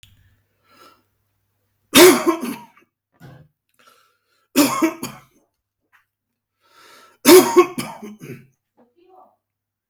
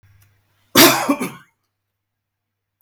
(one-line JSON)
{"three_cough_length": "9.9 s", "three_cough_amplitude": 32768, "three_cough_signal_mean_std_ratio": 0.27, "cough_length": "2.8 s", "cough_amplitude": 32768, "cough_signal_mean_std_ratio": 0.29, "survey_phase": "beta (2021-08-13 to 2022-03-07)", "age": "45-64", "gender": "Male", "wearing_mask": "Yes", "symptom_cough_any": true, "symptom_runny_or_blocked_nose": true, "symptom_sore_throat": true, "symptom_fever_high_temperature": true, "symptom_change_to_sense_of_smell_or_taste": true, "symptom_onset": "3 days", "smoker_status": "Ex-smoker", "respiratory_condition_asthma": false, "respiratory_condition_other": false, "recruitment_source": "Test and Trace", "submission_delay": "2 days", "covid_test_result": "Positive", "covid_test_method": "RT-qPCR", "covid_ct_value": 21.9, "covid_ct_gene": "S gene", "covid_ct_mean": 22.4, "covid_viral_load": "44000 copies/ml", "covid_viral_load_category": "Low viral load (10K-1M copies/ml)"}